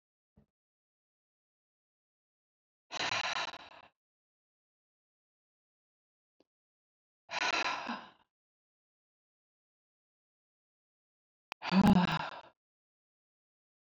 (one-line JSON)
{"exhalation_length": "13.8 s", "exhalation_amplitude": 5273, "exhalation_signal_mean_std_ratio": 0.24, "survey_phase": "beta (2021-08-13 to 2022-03-07)", "age": "65+", "gender": "Female", "wearing_mask": "No", "symptom_none": true, "smoker_status": "Ex-smoker", "respiratory_condition_asthma": false, "respiratory_condition_other": false, "recruitment_source": "REACT", "submission_delay": "0 days", "covid_test_result": "Negative", "covid_test_method": "RT-qPCR"}